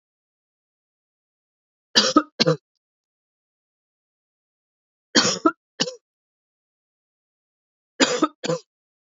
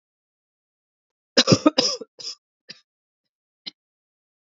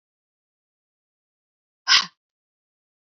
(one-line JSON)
{"three_cough_length": "9.0 s", "three_cough_amplitude": 28762, "three_cough_signal_mean_std_ratio": 0.25, "cough_length": "4.5 s", "cough_amplitude": 27565, "cough_signal_mean_std_ratio": 0.22, "exhalation_length": "3.2 s", "exhalation_amplitude": 29313, "exhalation_signal_mean_std_ratio": 0.16, "survey_phase": "beta (2021-08-13 to 2022-03-07)", "age": "45-64", "gender": "Female", "wearing_mask": "No", "symptom_new_continuous_cough": true, "symptom_runny_or_blocked_nose": true, "symptom_shortness_of_breath": true, "symptom_fatigue": true, "symptom_fever_high_temperature": true, "symptom_headache": true, "symptom_change_to_sense_of_smell_or_taste": true, "symptom_onset": "3 days", "smoker_status": "Never smoked", "respiratory_condition_asthma": false, "respiratory_condition_other": false, "recruitment_source": "Test and Trace", "submission_delay": "2 days", "covid_test_result": "Positive", "covid_test_method": "RT-qPCR", "covid_ct_value": 22.1, "covid_ct_gene": "N gene"}